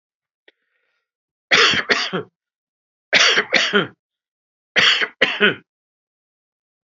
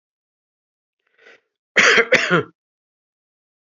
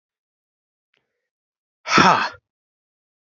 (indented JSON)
{
  "three_cough_length": "7.0 s",
  "three_cough_amplitude": 30809,
  "three_cough_signal_mean_std_ratio": 0.39,
  "cough_length": "3.7 s",
  "cough_amplitude": 32768,
  "cough_signal_mean_std_ratio": 0.31,
  "exhalation_length": "3.3 s",
  "exhalation_amplitude": 31072,
  "exhalation_signal_mean_std_ratio": 0.25,
  "survey_phase": "beta (2021-08-13 to 2022-03-07)",
  "age": "45-64",
  "gender": "Male",
  "wearing_mask": "No",
  "symptom_none": true,
  "smoker_status": "Never smoked",
  "respiratory_condition_asthma": false,
  "respiratory_condition_other": false,
  "recruitment_source": "REACT",
  "submission_delay": "1 day",
  "covid_test_result": "Negative",
  "covid_test_method": "RT-qPCR"
}